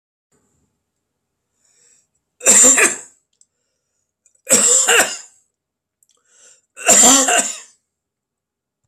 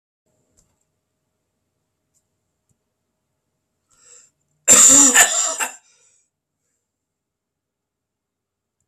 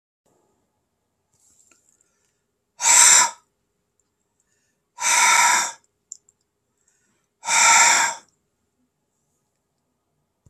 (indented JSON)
{
  "three_cough_length": "8.9 s",
  "three_cough_amplitude": 32768,
  "three_cough_signal_mean_std_ratio": 0.36,
  "cough_length": "8.9 s",
  "cough_amplitude": 32768,
  "cough_signal_mean_std_ratio": 0.24,
  "exhalation_length": "10.5 s",
  "exhalation_amplitude": 32767,
  "exhalation_signal_mean_std_ratio": 0.33,
  "survey_phase": "beta (2021-08-13 to 2022-03-07)",
  "age": "65+",
  "gender": "Male",
  "wearing_mask": "No",
  "symptom_cough_any": true,
  "smoker_status": "Ex-smoker",
  "respiratory_condition_asthma": false,
  "respiratory_condition_other": false,
  "recruitment_source": "REACT",
  "submission_delay": "1 day",
  "covid_test_result": "Negative",
  "covid_test_method": "RT-qPCR"
}